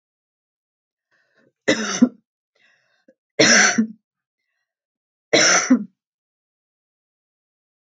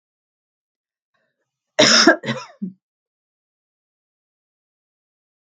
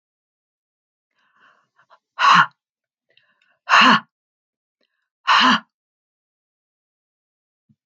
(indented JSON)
{
  "three_cough_length": "7.9 s",
  "three_cough_amplitude": 30264,
  "three_cough_signal_mean_std_ratio": 0.31,
  "cough_length": "5.5 s",
  "cough_amplitude": 32766,
  "cough_signal_mean_std_ratio": 0.23,
  "exhalation_length": "7.9 s",
  "exhalation_amplitude": 32768,
  "exhalation_signal_mean_std_ratio": 0.27,
  "survey_phase": "beta (2021-08-13 to 2022-03-07)",
  "age": "65+",
  "gender": "Female",
  "wearing_mask": "No",
  "symptom_runny_or_blocked_nose": true,
  "symptom_sore_throat": true,
  "symptom_headache": true,
  "symptom_onset": "12 days",
  "smoker_status": "Never smoked",
  "respiratory_condition_asthma": false,
  "respiratory_condition_other": false,
  "recruitment_source": "REACT",
  "submission_delay": "1 day",
  "covid_test_result": "Negative",
  "covid_test_method": "RT-qPCR",
  "influenza_a_test_result": "Negative",
  "influenza_b_test_result": "Negative"
}